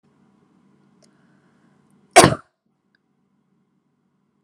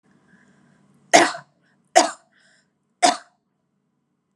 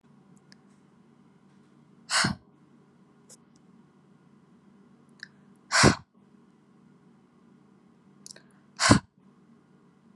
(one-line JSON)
{"cough_length": "4.4 s", "cough_amplitude": 32768, "cough_signal_mean_std_ratio": 0.15, "three_cough_length": "4.4 s", "three_cough_amplitude": 32767, "three_cough_signal_mean_std_ratio": 0.23, "exhalation_length": "10.2 s", "exhalation_amplitude": 25718, "exhalation_signal_mean_std_ratio": 0.22, "survey_phase": "alpha (2021-03-01 to 2021-08-12)", "age": "18-44", "gender": "Female", "wearing_mask": "No", "symptom_none": true, "smoker_status": "Never smoked", "respiratory_condition_asthma": false, "respiratory_condition_other": false, "recruitment_source": "REACT", "submission_delay": "1 day", "covid_test_result": "Negative", "covid_test_method": "RT-qPCR"}